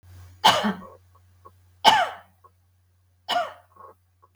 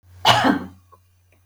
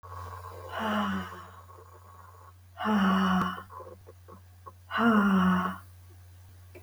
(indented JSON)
{
  "three_cough_length": "4.4 s",
  "three_cough_amplitude": 32768,
  "three_cough_signal_mean_std_ratio": 0.32,
  "cough_length": "1.5 s",
  "cough_amplitude": 32192,
  "cough_signal_mean_std_ratio": 0.42,
  "exhalation_length": "6.8 s",
  "exhalation_amplitude": 8742,
  "exhalation_signal_mean_std_ratio": 0.57,
  "survey_phase": "beta (2021-08-13 to 2022-03-07)",
  "age": "45-64",
  "gender": "Female",
  "wearing_mask": "No",
  "symptom_none": true,
  "smoker_status": "Never smoked",
  "respiratory_condition_asthma": false,
  "respiratory_condition_other": false,
  "recruitment_source": "REACT",
  "submission_delay": "1 day",
  "covid_test_result": "Negative",
  "covid_test_method": "RT-qPCR",
  "influenza_a_test_result": "Negative",
  "influenza_b_test_result": "Negative"
}